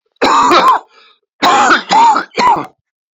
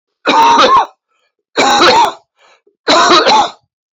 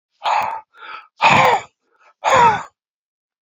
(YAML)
cough_length: 3.2 s
cough_amplitude: 30516
cough_signal_mean_std_ratio: 0.69
three_cough_length: 3.9 s
three_cough_amplitude: 32768
three_cough_signal_mean_std_ratio: 0.66
exhalation_length: 3.4 s
exhalation_amplitude: 32768
exhalation_signal_mean_std_ratio: 0.48
survey_phase: beta (2021-08-13 to 2022-03-07)
age: 65+
gender: Male
wearing_mask: 'No'
symptom_none: true
smoker_status: Ex-smoker
respiratory_condition_asthma: false
respiratory_condition_other: false
recruitment_source: REACT
submission_delay: 2 days
covid_test_result: Negative
covid_test_method: RT-qPCR